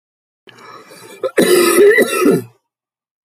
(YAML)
cough_length: 3.2 s
cough_amplitude: 32503
cough_signal_mean_std_ratio: 0.52
survey_phase: beta (2021-08-13 to 2022-03-07)
age: 45-64
gender: Male
wearing_mask: 'No'
symptom_cough_any: true
symptom_runny_or_blocked_nose: true
symptom_headache: true
symptom_onset: 4 days
smoker_status: Ex-smoker
respiratory_condition_asthma: false
respiratory_condition_other: false
recruitment_source: Test and Trace
submission_delay: 1 day
covid_test_result: Positive
covid_test_method: RT-qPCR
covid_ct_value: 31.3
covid_ct_gene: N gene